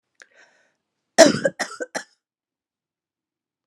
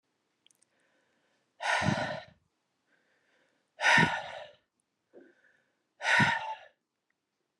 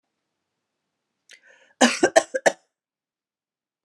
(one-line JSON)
{"three_cough_length": "3.7 s", "three_cough_amplitude": 32768, "three_cough_signal_mean_std_ratio": 0.21, "exhalation_length": "7.6 s", "exhalation_amplitude": 9022, "exhalation_signal_mean_std_ratio": 0.34, "cough_length": "3.8 s", "cough_amplitude": 28764, "cough_signal_mean_std_ratio": 0.22, "survey_phase": "alpha (2021-03-01 to 2021-08-12)", "age": "45-64", "gender": "Female", "wearing_mask": "No", "symptom_none": true, "smoker_status": "Never smoked", "respiratory_condition_asthma": false, "respiratory_condition_other": false, "recruitment_source": "REACT", "submission_delay": "1 day", "covid_test_result": "Negative", "covid_test_method": "RT-qPCR"}